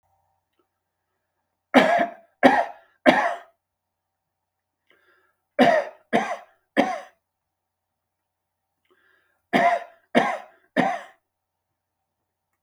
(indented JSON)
{
  "three_cough_length": "12.6 s",
  "three_cough_amplitude": 32766,
  "three_cough_signal_mean_std_ratio": 0.31,
  "survey_phase": "beta (2021-08-13 to 2022-03-07)",
  "age": "45-64",
  "gender": "Male",
  "wearing_mask": "No",
  "symptom_shortness_of_breath": true,
  "symptom_fatigue": true,
  "symptom_onset": "12 days",
  "smoker_status": "Ex-smoker",
  "respiratory_condition_asthma": false,
  "respiratory_condition_other": false,
  "recruitment_source": "REACT",
  "submission_delay": "0 days",
  "covid_test_result": "Negative",
  "covid_test_method": "RT-qPCR",
  "influenza_a_test_result": "Negative",
  "influenza_b_test_result": "Negative"
}